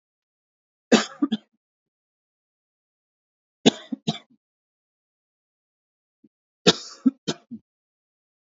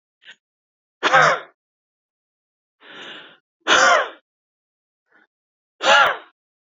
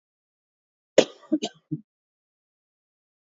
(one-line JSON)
{"three_cough_length": "8.5 s", "three_cough_amplitude": 31155, "three_cough_signal_mean_std_ratio": 0.18, "exhalation_length": "6.7 s", "exhalation_amplitude": 28466, "exhalation_signal_mean_std_ratio": 0.33, "cough_length": "3.3 s", "cough_amplitude": 26730, "cough_signal_mean_std_ratio": 0.16, "survey_phase": "beta (2021-08-13 to 2022-03-07)", "age": "18-44", "gender": "Male", "wearing_mask": "No", "symptom_none": true, "symptom_onset": "12 days", "smoker_status": "Current smoker (11 or more cigarettes per day)", "respiratory_condition_asthma": false, "respiratory_condition_other": false, "recruitment_source": "REACT", "submission_delay": "0 days", "covid_test_result": "Negative", "covid_test_method": "RT-qPCR"}